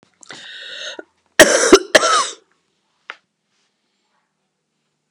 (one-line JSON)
{"cough_length": "5.1 s", "cough_amplitude": 32768, "cough_signal_mean_std_ratio": 0.29, "survey_phase": "beta (2021-08-13 to 2022-03-07)", "age": "65+", "gender": "Male", "wearing_mask": "No", "symptom_fatigue": true, "smoker_status": "Never smoked", "respiratory_condition_asthma": false, "respiratory_condition_other": false, "recruitment_source": "Test and Trace", "submission_delay": "1 day", "covid_test_result": "Positive", "covid_test_method": "RT-qPCR", "covid_ct_value": 19.6, "covid_ct_gene": "ORF1ab gene", "covid_ct_mean": 20.2, "covid_viral_load": "240000 copies/ml", "covid_viral_load_category": "Low viral load (10K-1M copies/ml)"}